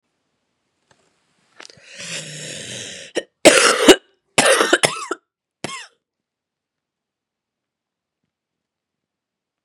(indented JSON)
{
  "three_cough_length": "9.6 s",
  "three_cough_amplitude": 32768,
  "three_cough_signal_mean_std_ratio": 0.27,
  "survey_phase": "beta (2021-08-13 to 2022-03-07)",
  "age": "18-44",
  "gender": "Female",
  "wearing_mask": "No",
  "symptom_runny_or_blocked_nose": true,
  "symptom_fatigue": true,
  "symptom_change_to_sense_of_smell_or_taste": true,
  "symptom_onset": "5 days",
  "smoker_status": "Never smoked",
  "respiratory_condition_asthma": true,
  "respiratory_condition_other": false,
  "recruitment_source": "Test and Trace",
  "submission_delay": "2 days",
  "covid_test_result": "Positive",
  "covid_test_method": "RT-qPCR",
  "covid_ct_value": 16.4,
  "covid_ct_gene": "S gene",
  "covid_ct_mean": 18.8,
  "covid_viral_load": "660000 copies/ml",
  "covid_viral_load_category": "Low viral load (10K-1M copies/ml)"
}